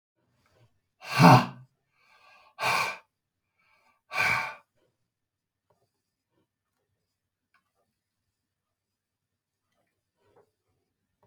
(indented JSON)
{
  "exhalation_length": "11.3 s",
  "exhalation_amplitude": 24947,
  "exhalation_signal_mean_std_ratio": 0.2,
  "survey_phase": "alpha (2021-03-01 to 2021-08-12)",
  "age": "45-64",
  "gender": "Male",
  "wearing_mask": "No",
  "symptom_none": true,
  "smoker_status": "Never smoked",
  "respiratory_condition_asthma": false,
  "respiratory_condition_other": false,
  "recruitment_source": "REACT",
  "submission_delay": "1 day",
  "covid_test_result": "Negative",
  "covid_test_method": "RT-qPCR"
}